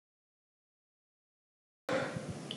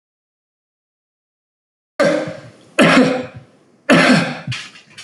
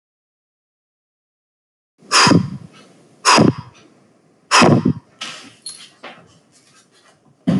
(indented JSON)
{
  "cough_length": "2.6 s",
  "cough_amplitude": 2497,
  "cough_signal_mean_std_ratio": 0.37,
  "three_cough_length": "5.0 s",
  "three_cough_amplitude": 32767,
  "three_cough_signal_mean_std_ratio": 0.42,
  "exhalation_length": "7.6 s",
  "exhalation_amplitude": 31189,
  "exhalation_signal_mean_std_ratio": 0.34,
  "survey_phase": "beta (2021-08-13 to 2022-03-07)",
  "age": "45-64",
  "gender": "Male",
  "wearing_mask": "No",
  "symptom_none": true,
  "smoker_status": "Ex-smoker",
  "respiratory_condition_asthma": false,
  "respiratory_condition_other": false,
  "recruitment_source": "REACT",
  "submission_delay": "10 days",
  "covid_test_result": "Negative",
  "covid_test_method": "RT-qPCR"
}